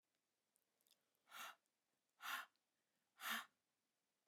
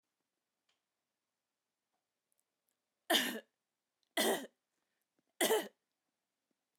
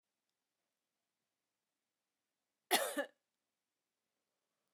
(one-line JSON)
{"exhalation_length": "4.3 s", "exhalation_amplitude": 712, "exhalation_signal_mean_std_ratio": 0.31, "three_cough_length": "6.8 s", "three_cough_amplitude": 4427, "three_cough_signal_mean_std_ratio": 0.26, "cough_length": "4.7 s", "cough_amplitude": 3900, "cough_signal_mean_std_ratio": 0.18, "survey_phase": "alpha (2021-03-01 to 2021-08-12)", "age": "45-64", "gender": "Female", "wearing_mask": "No", "symptom_none": true, "smoker_status": "Never smoked", "respiratory_condition_asthma": false, "respiratory_condition_other": false, "recruitment_source": "REACT", "submission_delay": "2 days", "covid_test_result": "Negative", "covid_test_method": "RT-qPCR"}